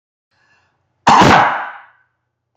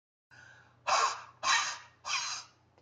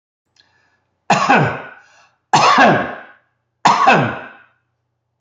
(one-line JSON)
{"cough_length": "2.6 s", "cough_amplitude": 30738, "cough_signal_mean_std_ratio": 0.4, "exhalation_length": "2.8 s", "exhalation_amplitude": 6115, "exhalation_signal_mean_std_ratio": 0.49, "three_cough_length": "5.2 s", "three_cough_amplitude": 31133, "three_cough_signal_mean_std_ratio": 0.46, "survey_phase": "beta (2021-08-13 to 2022-03-07)", "age": "18-44", "gender": "Male", "wearing_mask": "No", "symptom_none": true, "smoker_status": "Never smoked", "respiratory_condition_asthma": false, "respiratory_condition_other": false, "recruitment_source": "REACT", "submission_delay": "1 day", "covid_test_result": "Negative", "covid_test_method": "RT-qPCR", "influenza_a_test_result": "Negative", "influenza_b_test_result": "Negative"}